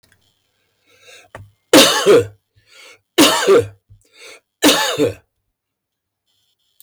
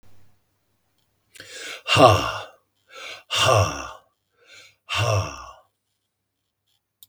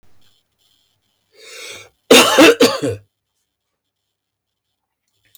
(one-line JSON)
{"three_cough_length": "6.8 s", "three_cough_amplitude": 32768, "three_cough_signal_mean_std_ratio": 0.38, "exhalation_length": "7.1 s", "exhalation_amplitude": 32768, "exhalation_signal_mean_std_ratio": 0.35, "cough_length": "5.4 s", "cough_amplitude": 32768, "cough_signal_mean_std_ratio": 0.3, "survey_phase": "beta (2021-08-13 to 2022-03-07)", "age": "45-64", "gender": "Male", "wearing_mask": "No", "symptom_none": true, "smoker_status": "Never smoked", "respiratory_condition_asthma": false, "respiratory_condition_other": false, "recruitment_source": "REACT", "submission_delay": "1 day", "covid_test_result": "Negative", "covid_test_method": "RT-qPCR"}